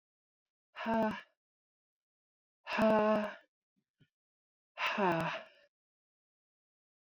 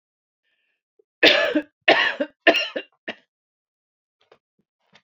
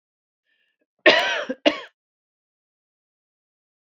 exhalation_length: 7.1 s
exhalation_amplitude: 4164
exhalation_signal_mean_std_ratio: 0.37
three_cough_length: 5.0 s
three_cough_amplitude: 32768
three_cough_signal_mean_std_ratio: 0.31
cough_length: 3.8 s
cough_amplitude: 27297
cough_signal_mean_std_ratio: 0.25
survey_phase: beta (2021-08-13 to 2022-03-07)
age: 45-64
gender: Female
wearing_mask: 'No'
symptom_none: true
symptom_onset: 6 days
smoker_status: Never smoked
respiratory_condition_asthma: false
respiratory_condition_other: false
recruitment_source: REACT
submission_delay: 1 day
covid_test_result: Negative
covid_test_method: RT-qPCR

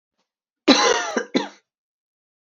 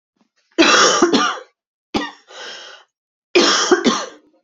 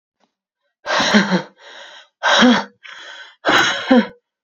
cough_length: 2.5 s
cough_amplitude: 28364
cough_signal_mean_std_ratio: 0.36
three_cough_length: 4.4 s
three_cough_amplitude: 32768
three_cough_signal_mean_std_ratio: 0.5
exhalation_length: 4.4 s
exhalation_amplitude: 32768
exhalation_signal_mean_std_ratio: 0.49
survey_phase: beta (2021-08-13 to 2022-03-07)
age: 18-44
gender: Female
wearing_mask: 'No'
symptom_cough_any: true
symptom_runny_or_blocked_nose: true
symptom_sore_throat: true
symptom_fatigue: true
symptom_fever_high_temperature: true
symptom_headache: true
symptom_onset: 2 days
smoker_status: Current smoker (e-cigarettes or vapes only)
respiratory_condition_asthma: false
respiratory_condition_other: false
recruitment_source: Test and Trace
submission_delay: 2 days
covid_test_result: Positive
covid_test_method: RT-qPCR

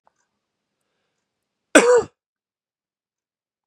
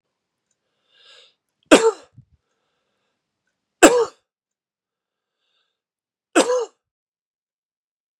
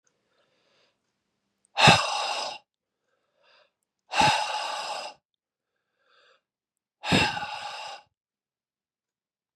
cough_length: 3.7 s
cough_amplitude: 32767
cough_signal_mean_std_ratio: 0.21
three_cough_length: 8.2 s
three_cough_amplitude: 32768
three_cough_signal_mean_std_ratio: 0.21
exhalation_length: 9.6 s
exhalation_amplitude: 27736
exhalation_signal_mean_std_ratio: 0.32
survey_phase: beta (2021-08-13 to 2022-03-07)
age: 45-64
gender: Male
wearing_mask: 'No'
symptom_none: true
smoker_status: Never smoked
respiratory_condition_asthma: false
respiratory_condition_other: false
recruitment_source: REACT
submission_delay: 2 days
covid_test_result: Negative
covid_test_method: RT-qPCR
influenza_a_test_result: Negative
influenza_b_test_result: Negative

